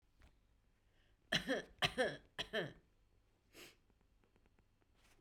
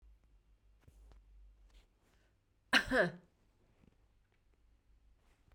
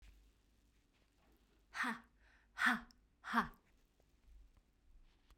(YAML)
three_cough_length: 5.2 s
three_cough_amplitude: 3305
three_cough_signal_mean_std_ratio: 0.32
cough_length: 5.5 s
cough_amplitude: 5667
cough_signal_mean_std_ratio: 0.23
exhalation_length: 5.4 s
exhalation_amplitude: 3216
exhalation_signal_mean_std_ratio: 0.29
survey_phase: beta (2021-08-13 to 2022-03-07)
age: 45-64
gender: Female
wearing_mask: 'No'
symptom_sore_throat: true
symptom_headache: true
smoker_status: Never smoked
respiratory_condition_asthma: false
respiratory_condition_other: false
recruitment_source: REACT
submission_delay: 2 days
covid_test_result: Negative
covid_test_method: RT-qPCR